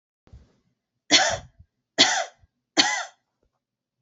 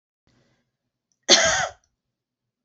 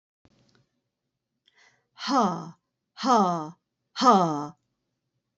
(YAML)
three_cough_length: 4.0 s
three_cough_amplitude: 25444
three_cough_signal_mean_std_ratio: 0.32
cough_length: 2.6 s
cough_amplitude: 30482
cough_signal_mean_std_ratio: 0.28
exhalation_length: 5.4 s
exhalation_amplitude: 16760
exhalation_signal_mean_std_ratio: 0.37
survey_phase: beta (2021-08-13 to 2022-03-07)
age: 45-64
gender: Female
wearing_mask: 'No'
symptom_none: true
smoker_status: Never smoked
respiratory_condition_asthma: false
respiratory_condition_other: false
recruitment_source: REACT
submission_delay: 1 day
covid_test_result: Negative
covid_test_method: RT-qPCR
influenza_a_test_result: Negative
influenza_b_test_result: Negative